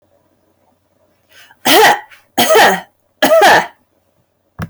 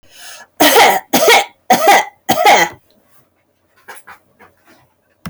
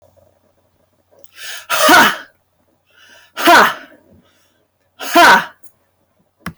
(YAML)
three_cough_length: 4.7 s
three_cough_amplitude: 32767
three_cough_signal_mean_std_ratio: 0.46
cough_length: 5.3 s
cough_amplitude: 31810
cough_signal_mean_std_ratio: 0.47
exhalation_length: 6.6 s
exhalation_amplitude: 32588
exhalation_signal_mean_std_ratio: 0.37
survey_phase: alpha (2021-03-01 to 2021-08-12)
age: 18-44
gender: Female
wearing_mask: 'No'
symptom_none: true
symptom_onset: 2 days
smoker_status: Never smoked
respiratory_condition_asthma: false
respiratory_condition_other: false
recruitment_source: REACT
submission_delay: 1 day
covid_test_result: Negative
covid_test_method: RT-qPCR